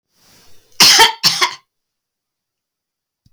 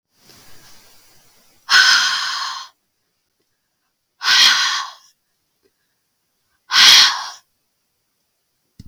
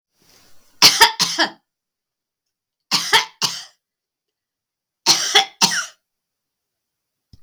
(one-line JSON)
{"cough_length": "3.3 s", "cough_amplitude": 32768, "cough_signal_mean_std_ratio": 0.33, "exhalation_length": "8.9 s", "exhalation_amplitude": 32768, "exhalation_signal_mean_std_ratio": 0.36, "three_cough_length": "7.4 s", "three_cough_amplitude": 32768, "three_cough_signal_mean_std_ratio": 0.32, "survey_phase": "beta (2021-08-13 to 2022-03-07)", "age": "65+", "gender": "Female", "wearing_mask": "No", "symptom_runny_or_blocked_nose": true, "symptom_headache": true, "symptom_onset": "12 days", "smoker_status": "Never smoked", "respiratory_condition_asthma": false, "respiratory_condition_other": false, "recruitment_source": "REACT", "submission_delay": "2 days", "covid_test_result": "Negative", "covid_test_method": "RT-qPCR", "influenza_a_test_result": "Negative", "influenza_b_test_result": "Negative"}